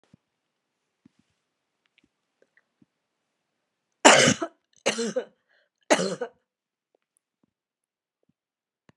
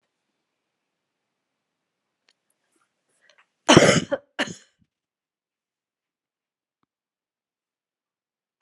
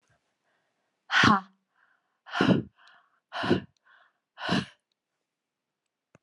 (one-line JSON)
{"three_cough_length": "9.0 s", "three_cough_amplitude": 32523, "three_cough_signal_mean_std_ratio": 0.21, "cough_length": "8.6 s", "cough_amplitude": 32768, "cough_signal_mean_std_ratio": 0.16, "exhalation_length": "6.2 s", "exhalation_amplitude": 14836, "exhalation_signal_mean_std_ratio": 0.3, "survey_phase": "alpha (2021-03-01 to 2021-08-12)", "age": "65+", "gender": "Female", "wearing_mask": "No", "symptom_none": true, "smoker_status": "Ex-smoker", "respiratory_condition_asthma": false, "respiratory_condition_other": false, "recruitment_source": "REACT", "submission_delay": "2 days", "covid_test_result": "Negative", "covid_test_method": "RT-qPCR"}